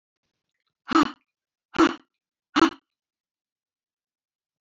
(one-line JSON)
{"exhalation_length": "4.6 s", "exhalation_amplitude": 17875, "exhalation_signal_mean_std_ratio": 0.23, "survey_phase": "beta (2021-08-13 to 2022-03-07)", "age": "65+", "gender": "Female", "wearing_mask": "No", "symptom_none": true, "smoker_status": "Ex-smoker", "respiratory_condition_asthma": false, "respiratory_condition_other": false, "recruitment_source": "REACT", "submission_delay": "7 days", "covid_test_result": "Negative", "covid_test_method": "RT-qPCR"}